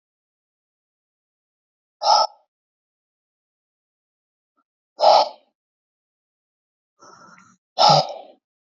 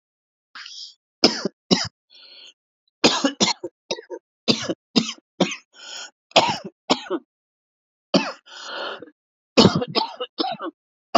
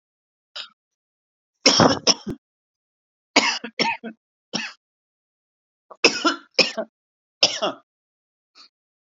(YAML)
exhalation_length: 8.7 s
exhalation_amplitude: 32768
exhalation_signal_mean_std_ratio: 0.24
cough_length: 11.2 s
cough_amplitude: 32768
cough_signal_mean_std_ratio: 0.35
three_cough_length: 9.1 s
three_cough_amplitude: 31839
three_cough_signal_mean_std_ratio: 0.3
survey_phase: beta (2021-08-13 to 2022-03-07)
age: 45-64
gender: Male
wearing_mask: 'No'
symptom_cough_any: true
symptom_runny_or_blocked_nose: true
symptom_shortness_of_breath: true
symptom_sore_throat: true
symptom_abdominal_pain: true
symptom_fatigue: true
symptom_headache: true
symptom_change_to_sense_of_smell_or_taste: true
symptom_onset: 4 days
smoker_status: Ex-smoker
respiratory_condition_asthma: false
respiratory_condition_other: false
recruitment_source: Test and Trace
submission_delay: 1 day
covid_test_result: Positive
covid_test_method: RT-qPCR